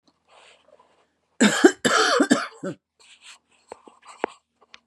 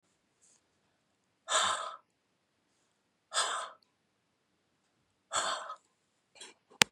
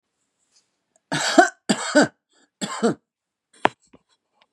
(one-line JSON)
{"three_cough_length": "4.9 s", "three_cough_amplitude": 29967, "three_cough_signal_mean_std_ratio": 0.33, "exhalation_length": "6.9 s", "exhalation_amplitude": 32768, "exhalation_signal_mean_std_ratio": 0.27, "cough_length": "4.5 s", "cough_amplitude": 31227, "cough_signal_mean_std_ratio": 0.3, "survey_phase": "beta (2021-08-13 to 2022-03-07)", "age": "45-64", "gender": "Female", "wearing_mask": "No", "symptom_none": true, "smoker_status": "Current smoker (11 or more cigarettes per day)", "respiratory_condition_asthma": false, "respiratory_condition_other": false, "recruitment_source": "REACT", "submission_delay": "1 day", "covid_test_result": "Negative", "covid_test_method": "RT-qPCR", "influenza_a_test_result": "Negative", "influenza_b_test_result": "Negative"}